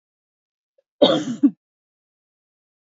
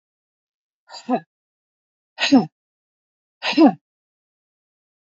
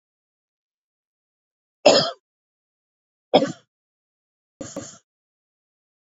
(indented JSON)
{
  "cough_length": "2.9 s",
  "cough_amplitude": 26243,
  "cough_signal_mean_std_ratio": 0.26,
  "exhalation_length": "5.1 s",
  "exhalation_amplitude": 25875,
  "exhalation_signal_mean_std_ratio": 0.25,
  "three_cough_length": "6.1 s",
  "three_cough_amplitude": 32768,
  "three_cough_signal_mean_std_ratio": 0.19,
  "survey_phase": "beta (2021-08-13 to 2022-03-07)",
  "age": "65+",
  "gender": "Female",
  "wearing_mask": "No",
  "symptom_sore_throat": true,
  "symptom_fatigue": true,
  "smoker_status": "Ex-smoker",
  "respiratory_condition_asthma": false,
  "respiratory_condition_other": false,
  "recruitment_source": "REACT",
  "submission_delay": "2 days",
  "covid_test_result": "Negative",
  "covid_test_method": "RT-qPCR"
}